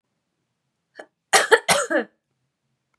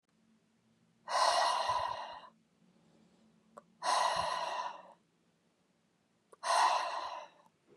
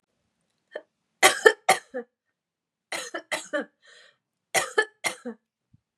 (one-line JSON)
{"cough_length": "3.0 s", "cough_amplitude": 29197, "cough_signal_mean_std_ratio": 0.3, "exhalation_length": "7.8 s", "exhalation_amplitude": 5023, "exhalation_signal_mean_std_ratio": 0.49, "three_cough_length": "6.0 s", "three_cough_amplitude": 32105, "three_cough_signal_mean_std_ratio": 0.26, "survey_phase": "beta (2021-08-13 to 2022-03-07)", "age": "18-44", "gender": "Female", "wearing_mask": "No", "symptom_none": true, "smoker_status": "Never smoked", "respiratory_condition_asthma": false, "respiratory_condition_other": false, "recruitment_source": "REACT", "submission_delay": "2 days", "covid_test_result": "Negative", "covid_test_method": "RT-qPCR"}